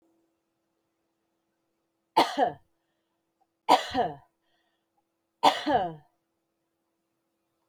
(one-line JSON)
{"three_cough_length": "7.7 s", "three_cough_amplitude": 17451, "three_cough_signal_mean_std_ratio": 0.27, "survey_phase": "beta (2021-08-13 to 2022-03-07)", "age": "45-64", "gender": "Female", "wearing_mask": "No", "symptom_none": true, "smoker_status": "Never smoked", "respiratory_condition_asthma": false, "respiratory_condition_other": false, "recruitment_source": "REACT", "submission_delay": "2 days", "covid_test_result": "Negative", "covid_test_method": "RT-qPCR"}